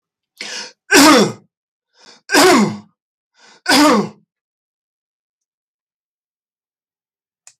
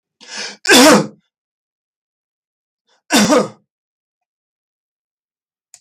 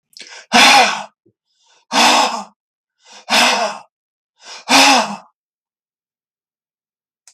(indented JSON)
{
  "three_cough_length": "7.6 s",
  "three_cough_amplitude": 32768,
  "three_cough_signal_mean_std_ratio": 0.36,
  "cough_length": "5.8 s",
  "cough_amplitude": 32768,
  "cough_signal_mean_std_ratio": 0.31,
  "exhalation_length": "7.3 s",
  "exhalation_amplitude": 32768,
  "exhalation_signal_mean_std_ratio": 0.41,
  "survey_phase": "beta (2021-08-13 to 2022-03-07)",
  "age": "65+",
  "gender": "Male",
  "wearing_mask": "No",
  "symptom_none": true,
  "symptom_onset": "12 days",
  "smoker_status": "Never smoked",
  "respiratory_condition_asthma": false,
  "respiratory_condition_other": false,
  "recruitment_source": "REACT",
  "submission_delay": "3 days",
  "covid_test_result": "Negative",
  "covid_test_method": "RT-qPCR",
  "influenza_a_test_result": "Negative",
  "influenza_b_test_result": "Negative"
}